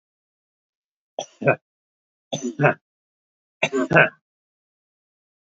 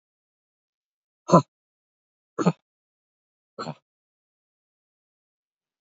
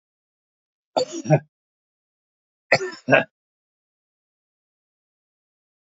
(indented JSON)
{
  "three_cough_length": "5.5 s",
  "three_cough_amplitude": 27149,
  "three_cough_signal_mean_std_ratio": 0.27,
  "exhalation_length": "5.8 s",
  "exhalation_amplitude": 27632,
  "exhalation_signal_mean_std_ratio": 0.14,
  "cough_length": "6.0 s",
  "cough_amplitude": 28399,
  "cough_signal_mean_std_ratio": 0.22,
  "survey_phase": "alpha (2021-03-01 to 2021-08-12)",
  "age": "65+",
  "gender": "Male",
  "wearing_mask": "No",
  "symptom_none": true,
  "smoker_status": "Ex-smoker",
  "respiratory_condition_asthma": false,
  "respiratory_condition_other": false,
  "recruitment_source": "REACT",
  "submission_delay": "2 days",
  "covid_test_result": "Negative",
  "covid_test_method": "RT-qPCR"
}